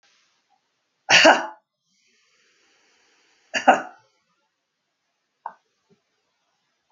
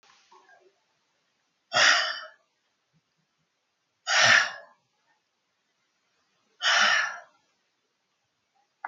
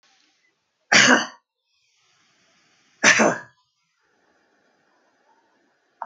{"cough_length": "6.9 s", "cough_amplitude": 27438, "cough_signal_mean_std_ratio": 0.21, "exhalation_length": "8.9 s", "exhalation_amplitude": 15907, "exhalation_signal_mean_std_ratio": 0.31, "three_cough_length": "6.1 s", "three_cough_amplitude": 30473, "three_cough_signal_mean_std_ratio": 0.26, "survey_phase": "alpha (2021-03-01 to 2021-08-12)", "age": "65+", "gender": "Female", "wearing_mask": "No", "symptom_headache": true, "symptom_onset": "4 days", "smoker_status": "Never smoked", "respiratory_condition_asthma": false, "respiratory_condition_other": false, "recruitment_source": "REACT", "submission_delay": "1 day", "covid_test_result": "Negative", "covid_test_method": "RT-qPCR"}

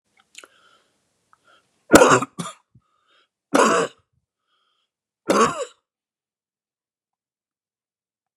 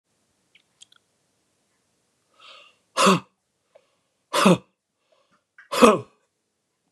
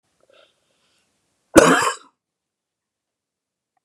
{"three_cough_length": "8.4 s", "three_cough_amplitude": 32768, "three_cough_signal_mean_std_ratio": 0.25, "exhalation_length": "6.9 s", "exhalation_amplitude": 32767, "exhalation_signal_mean_std_ratio": 0.24, "cough_length": "3.8 s", "cough_amplitude": 32768, "cough_signal_mean_std_ratio": 0.22, "survey_phase": "beta (2021-08-13 to 2022-03-07)", "age": "45-64", "gender": "Male", "wearing_mask": "No", "symptom_cough_any": true, "symptom_new_continuous_cough": true, "symptom_runny_or_blocked_nose": true, "symptom_sore_throat": true, "symptom_headache": true, "symptom_onset": "4 days", "smoker_status": "Ex-smoker", "respiratory_condition_asthma": false, "respiratory_condition_other": false, "recruitment_source": "REACT", "submission_delay": "2 days", "covid_test_result": "Positive", "covid_test_method": "RT-qPCR", "covid_ct_value": 26.0, "covid_ct_gene": "E gene", "influenza_a_test_result": "Negative", "influenza_b_test_result": "Negative"}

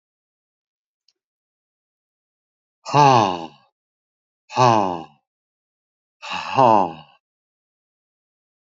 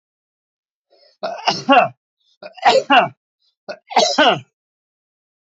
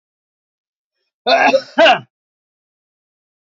{"exhalation_length": "8.6 s", "exhalation_amplitude": 29839, "exhalation_signal_mean_std_ratio": 0.29, "three_cough_length": "5.5 s", "three_cough_amplitude": 28063, "three_cough_signal_mean_std_ratio": 0.37, "cough_length": "3.5 s", "cough_amplitude": 28505, "cough_signal_mean_std_ratio": 0.32, "survey_phase": "alpha (2021-03-01 to 2021-08-12)", "age": "45-64", "gender": "Male", "wearing_mask": "No", "symptom_cough_any": true, "symptom_change_to_sense_of_smell_or_taste": true, "symptom_loss_of_taste": true, "symptom_onset": "3 days", "smoker_status": "Never smoked", "respiratory_condition_asthma": false, "respiratory_condition_other": false, "recruitment_source": "Test and Trace", "submission_delay": "2 days", "covid_test_result": "Positive", "covid_test_method": "RT-qPCR"}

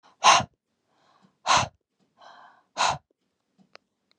{"exhalation_length": "4.2 s", "exhalation_amplitude": 20171, "exhalation_signal_mean_std_ratio": 0.28, "survey_phase": "beta (2021-08-13 to 2022-03-07)", "age": "18-44", "gender": "Female", "wearing_mask": "No", "symptom_cough_any": true, "symptom_runny_or_blocked_nose": true, "symptom_sore_throat": true, "symptom_fatigue": true, "symptom_fever_high_temperature": true, "smoker_status": "Never smoked", "respiratory_condition_asthma": false, "respiratory_condition_other": false, "recruitment_source": "Test and Trace", "submission_delay": "2 days", "covid_test_result": "Positive", "covid_test_method": "RT-qPCR", "covid_ct_value": 16.5, "covid_ct_gene": "ORF1ab gene"}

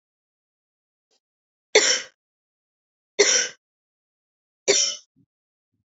{"three_cough_length": "6.0 s", "three_cough_amplitude": 28441, "three_cough_signal_mean_std_ratio": 0.27, "survey_phase": "beta (2021-08-13 to 2022-03-07)", "age": "18-44", "gender": "Female", "wearing_mask": "No", "symptom_cough_any": true, "symptom_runny_or_blocked_nose": true, "symptom_sore_throat": true, "symptom_fatigue": true, "symptom_headache": true, "smoker_status": "Never smoked", "respiratory_condition_asthma": false, "respiratory_condition_other": false, "recruitment_source": "Test and Trace", "submission_delay": "2 days", "covid_test_result": "Positive", "covid_test_method": "RT-qPCR", "covid_ct_value": 27.3, "covid_ct_gene": "ORF1ab gene"}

